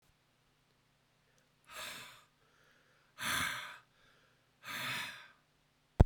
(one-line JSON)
{"exhalation_length": "6.1 s", "exhalation_amplitude": 11574, "exhalation_signal_mean_std_ratio": 0.24, "survey_phase": "beta (2021-08-13 to 2022-03-07)", "age": "65+", "gender": "Male", "wearing_mask": "No", "symptom_sore_throat": true, "smoker_status": "Never smoked", "respiratory_condition_asthma": false, "respiratory_condition_other": false, "recruitment_source": "REACT", "submission_delay": "3 days", "covid_test_result": "Negative", "covid_test_method": "RT-qPCR", "influenza_a_test_result": "Negative", "influenza_b_test_result": "Negative"}